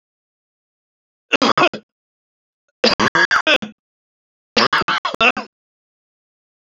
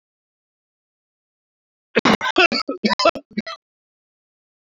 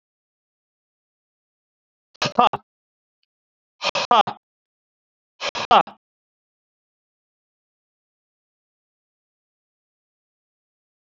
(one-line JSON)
{"three_cough_length": "6.7 s", "three_cough_amplitude": 30401, "three_cough_signal_mean_std_ratio": 0.35, "cough_length": "4.7 s", "cough_amplitude": 27384, "cough_signal_mean_std_ratio": 0.3, "exhalation_length": "11.1 s", "exhalation_amplitude": 32767, "exhalation_signal_mean_std_ratio": 0.18, "survey_phase": "beta (2021-08-13 to 2022-03-07)", "age": "65+", "gender": "Male", "wearing_mask": "No", "symptom_cough_any": true, "symptom_new_continuous_cough": true, "symptom_runny_or_blocked_nose": true, "symptom_shortness_of_breath": true, "symptom_sore_throat": true, "symptom_fatigue": true, "symptom_change_to_sense_of_smell_or_taste": true, "symptom_loss_of_taste": true, "symptom_onset": "6 days", "smoker_status": "Ex-smoker", "respiratory_condition_asthma": false, "respiratory_condition_other": false, "recruitment_source": "Test and Trace", "submission_delay": "2 days", "covid_test_result": "Positive", "covid_test_method": "RT-qPCR"}